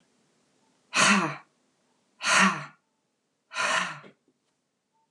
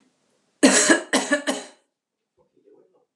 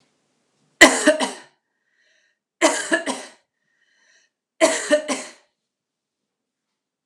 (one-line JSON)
{"exhalation_length": "5.1 s", "exhalation_amplitude": 13821, "exhalation_signal_mean_std_ratio": 0.37, "cough_length": "3.2 s", "cough_amplitude": 31500, "cough_signal_mean_std_ratio": 0.37, "three_cough_length": "7.1 s", "three_cough_amplitude": 32768, "three_cough_signal_mean_std_ratio": 0.29, "survey_phase": "alpha (2021-03-01 to 2021-08-12)", "age": "45-64", "gender": "Female", "wearing_mask": "No", "symptom_fatigue": true, "symptom_change_to_sense_of_smell_or_taste": true, "symptom_loss_of_taste": true, "symptom_onset": "4 days", "smoker_status": "Current smoker (1 to 10 cigarettes per day)", "respiratory_condition_asthma": true, "respiratory_condition_other": false, "recruitment_source": "Test and Trace", "submission_delay": "2 days", "covid_test_result": "Positive", "covid_test_method": "RT-qPCR", "covid_ct_value": 15.3, "covid_ct_gene": "ORF1ab gene", "covid_ct_mean": 15.5, "covid_viral_load": "8300000 copies/ml", "covid_viral_load_category": "High viral load (>1M copies/ml)"}